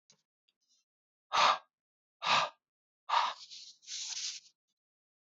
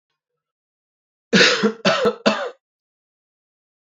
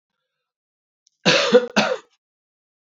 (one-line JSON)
{"exhalation_length": "5.2 s", "exhalation_amplitude": 6645, "exhalation_signal_mean_std_ratio": 0.35, "three_cough_length": "3.8 s", "three_cough_amplitude": 27527, "three_cough_signal_mean_std_ratio": 0.37, "cough_length": "2.8 s", "cough_amplitude": 32767, "cough_signal_mean_std_ratio": 0.34, "survey_phase": "alpha (2021-03-01 to 2021-08-12)", "age": "18-44", "gender": "Male", "wearing_mask": "No", "symptom_cough_any": true, "symptom_fatigue": true, "symptom_headache": true, "symptom_onset": "4 days", "smoker_status": "Current smoker (e-cigarettes or vapes only)", "respiratory_condition_asthma": false, "respiratory_condition_other": false, "recruitment_source": "Test and Trace", "submission_delay": "1 day", "covid_test_result": "Positive", "covid_test_method": "RT-qPCR"}